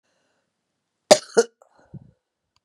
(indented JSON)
{
  "cough_length": "2.6 s",
  "cough_amplitude": 32768,
  "cough_signal_mean_std_ratio": 0.16,
  "survey_phase": "beta (2021-08-13 to 2022-03-07)",
  "age": "65+",
  "gender": "Female",
  "wearing_mask": "No",
  "symptom_cough_any": true,
  "symptom_runny_or_blocked_nose": true,
  "symptom_sore_throat": true,
  "smoker_status": "Ex-smoker",
  "respiratory_condition_asthma": false,
  "respiratory_condition_other": false,
  "recruitment_source": "Test and Trace",
  "submission_delay": "2 days",
  "covid_test_result": "Positive",
  "covid_test_method": "RT-qPCR"
}